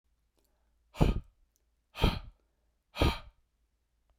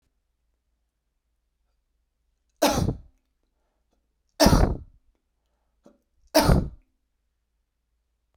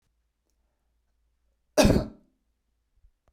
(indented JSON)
{
  "exhalation_length": "4.2 s",
  "exhalation_amplitude": 9146,
  "exhalation_signal_mean_std_ratio": 0.28,
  "three_cough_length": "8.4 s",
  "three_cough_amplitude": 22826,
  "three_cough_signal_mean_std_ratio": 0.26,
  "cough_length": "3.3 s",
  "cough_amplitude": 18266,
  "cough_signal_mean_std_ratio": 0.22,
  "survey_phase": "beta (2021-08-13 to 2022-03-07)",
  "age": "45-64",
  "gender": "Male",
  "wearing_mask": "No",
  "symptom_runny_or_blocked_nose": true,
  "symptom_shortness_of_breath": true,
  "symptom_sore_throat": true,
  "symptom_fatigue": true,
  "symptom_headache": true,
  "symptom_onset": "4 days",
  "smoker_status": "Never smoked",
  "respiratory_condition_asthma": false,
  "respiratory_condition_other": false,
  "recruitment_source": "Test and Trace",
  "submission_delay": "2 days",
  "covid_test_result": "Positive",
  "covid_test_method": "ePCR"
}